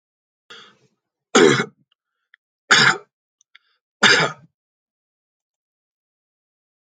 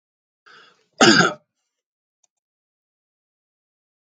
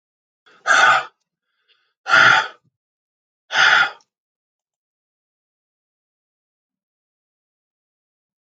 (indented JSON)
{
  "three_cough_length": "6.8 s",
  "three_cough_amplitude": 32583,
  "three_cough_signal_mean_std_ratio": 0.27,
  "cough_length": "4.1 s",
  "cough_amplitude": 29918,
  "cough_signal_mean_std_ratio": 0.21,
  "exhalation_length": "8.4 s",
  "exhalation_amplitude": 31802,
  "exhalation_signal_mean_std_ratio": 0.29,
  "survey_phase": "alpha (2021-03-01 to 2021-08-12)",
  "age": "45-64",
  "gender": "Male",
  "wearing_mask": "No",
  "symptom_none": true,
  "smoker_status": "Never smoked",
  "respiratory_condition_asthma": false,
  "respiratory_condition_other": false,
  "recruitment_source": "REACT",
  "submission_delay": "1 day",
  "covid_test_result": "Negative",
  "covid_test_method": "RT-qPCR"
}